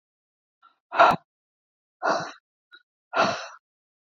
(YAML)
exhalation_length: 4.1 s
exhalation_amplitude: 25889
exhalation_signal_mean_std_ratio: 0.3
survey_phase: beta (2021-08-13 to 2022-03-07)
age: 45-64
gender: Female
wearing_mask: 'No'
symptom_none: true
symptom_onset: 12 days
smoker_status: Never smoked
respiratory_condition_asthma: false
respiratory_condition_other: false
recruitment_source: REACT
submission_delay: 3 days
covid_test_result: Negative
covid_test_method: RT-qPCR
influenza_a_test_result: Negative
influenza_b_test_result: Negative